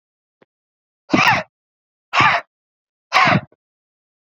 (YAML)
exhalation_length: 4.4 s
exhalation_amplitude: 32120
exhalation_signal_mean_std_ratio: 0.35
survey_phase: beta (2021-08-13 to 2022-03-07)
age: 18-44
gender: Male
wearing_mask: 'No'
symptom_cough_any: true
symptom_runny_or_blocked_nose: true
symptom_shortness_of_breath: true
symptom_sore_throat: true
symptom_diarrhoea: true
symptom_fatigue: true
symptom_fever_high_temperature: true
smoker_status: Ex-smoker
respiratory_condition_asthma: true
respiratory_condition_other: false
recruitment_source: Test and Trace
submission_delay: 2 days
covid_test_result: Positive
covid_test_method: RT-qPCR